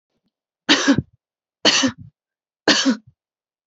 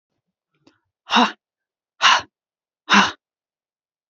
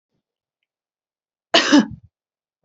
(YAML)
three_cough_length: 3.7 s
three_cough_amplitude: 32767
three_cough_signal_mean_std_ratio: 0.38
exhalation_length: 4.1 s
exhalation_amplitude: 29190
exhalation_signal_mean_std_ratio: 0.29
cough_length: 2.6 s
cough_amplitude: 32767
cough_signal_mean_std_ratio: 0.26
survey_phase: beta (2021-08-13 to 2022-03-07)
age: 18-44
gender: Female
wearing_mask: 'No'
symptom_none: true
smoker_status: Never smoked
respiratory_condition_asthma: false
respiratory_condition_other: false
recruitment_source: REACT
submission_delay: 2 days
covid_test_result: Negative
covid_test_method: RT-qPCR
influenza_a_test_result: Negative
influenza_b_test_result: Negative